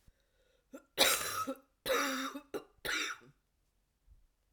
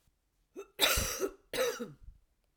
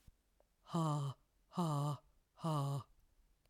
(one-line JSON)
{"three_cough_length": "4.5 s", "three_cough_amplitude": 8528, "three_cough_signal_mean_std_ratio": 0.44, "cough_length": "2.6 s", "cough_amplitude": 10757, "cough_signal_mean_std_ratio": 0.47, "exhalation_length": "3.5 s", "exhalation_amplitude": 1518, "exhalation_signal_mean_std_ratio": 0.6, "survey_phase": "beta (2021-08-13 to 2022-03-07)", "age": "45-64", "gender": "Female", "wearing_mask": "No", "symptom_cough_any": true, "symptom_runny_or_blocked_nose": true, "symptom_fatigue": true, "symptom_fever_high_temperature": true, "symptom_headache": true, "symptom_change_to_sense_of_smell_or_taste": true, "symptom_loss_of_taste": true, "symptom_onset": "2 days", "smoker_status": "Never smoked", "respiratory_condition_asthma": false, "respiratory_condition_other": false, "recruitment_source": "Test and Trace", "submission_delay": "1 day", "covid_test_result": "Positive", "covid_test_method": "RT-qPCR", "covid_ct_value": 16.8, "covid_ct_gene": "ORF1ab gene", "covid_ct_mean": 17.8, "covid_viral_load": "1500000 copies/ml", "covid_viral_load_category": "High viral load (>1M copies/ml)"}